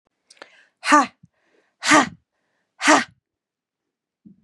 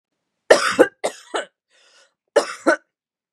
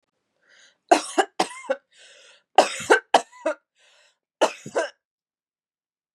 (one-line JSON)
{"exhalation_length": "4.4 s", "exhalation_amplitude": 31290, "exhalation_signal_mean_std_ratio": 0.29, "cough_length": "3.3 s", "cough_amplitude": 32768, "cough_signal_mean_std_ratio": 0.31, "three_cough_length": "6.1 s", "three_cough_amplitude": 30208, "three_cough_signal_mean_std_ratio": 0.28, "survey_phase": "beta (2021-08-13 to 2022-03-07)", "age": "18-44", "gender": "Female", "wearing_mask": "No", "symptom_none": true, "smoker_status": "Never smoked", "respiratory_condition_asthma": false, "respiratory_condition_other": false, "recruitment_source": "REACT", "submission_delay": "2 days", "covid_test_result": "Negative", "covid_test_method": "RT-qPCR", "influenza_a_test_result": "Negative", "influenza_b_test_result": "Negative"}